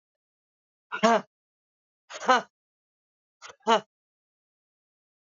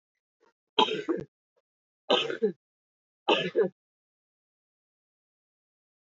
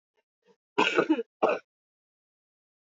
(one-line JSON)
{"exhalation_length": "5.3 s", "exhalation_amplitude": 14972, "exhalation_signal_mean_std_ratio": 0.24, "three_cough_length": "6.1 s", "three_cough_amplitude": 13564, "three_cough_signal_mean_std_ratio": 0.3, "cough_length": "3.0 s", "cough_amplitude": 12735, "cough_signal_mean_std_ratio": 0.32, "survey_phase": "alpha (2021-03-01 to 2021-08-12)", "age": "65+", "gender": "Female", "wearing_mask": "No", "symptom_none": true, "smoker_status": "Ex-smoker", "respiratory_condition_asthma": false, "respiratory_condition_other": true, "recruitment_source": "REACT", "submission_delay": "4 days", "covid_test_result": "Negative", "covid_test_method": "RT-qPCR"}